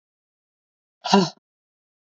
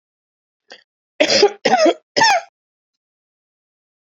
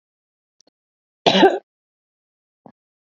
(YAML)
exhalation_length: 2.1 s
exhalation_amplitude: 28189
exhalation_signal_mean_std_ratio: 0.23
three_cough_length: 4.0 s
three_cough_amplitude: 31547
three_cough_signal_mean_std_ratio: 0.37
cough_length: 3.1 s
cough_amplitude: 28195
cough_signal_mean_std_ratio: 0.23
survey_phase: beta (2021-08-13 to 2022-03-07)
age: 45-64
gender: Female
wearing_mask: 'No'
symptom_runny_or_blocked_nose: true
symptom_sore_throat: true
symptom_headache: true
symptom_change_to_sense_of_smell_or_taste: true
symptom_loss_of_taste: true
symptom_onset: 3 days
smoker_status: Current smoker (1 to 10 cigarettes per day)
respiratory_condition_asthma: false
respiratory_condition_other: false
recruitment_source: Test and Trace
submission_delay: 2 days
covid_test_result: Positive
covid_test_method: RT-qPCR
covid_ct_value: 20.0
covid_ct_gene: N gene
covid_ct_mean: 20.5
covid_viral_load: 190000 copies/ml
covid_viral_load_category: Low viral load (10K-1M copies/ml)